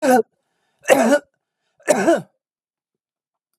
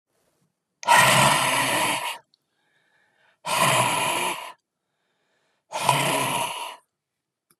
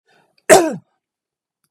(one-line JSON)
{"three_cough_length": "3.6 s", "three_cough_amplitude": 32751, "three_cough_signal_mean_std_ratio": 0.38, "exhalation_length": "7.6 s", "exhalation_amplitude": 23636, "exhalation_signal_mean_std_ratio": 0.52, "cough_length": "1.7 s", "cough_amplitude": 32768, "cough_signal_mean_std_ratio": 0.27, "survey_phase": "beta (2021-08-13 to 2022-03-07)", "age": "45-64", "gender": "Male", "wearing_mask": "No", "symptom_none": true, "smoker_status": "Never smoked", "respiratory_condition_asthma": false, "respiratory_condition_other": false, "recruitment_source": "REACT", "submission_delay": "2 days", "covid_test_result": "Negative", "covid_test_method": "RT-qPCR", "influenza_a_test_result": "Negative", "influenza_b_test_result": "Negative"}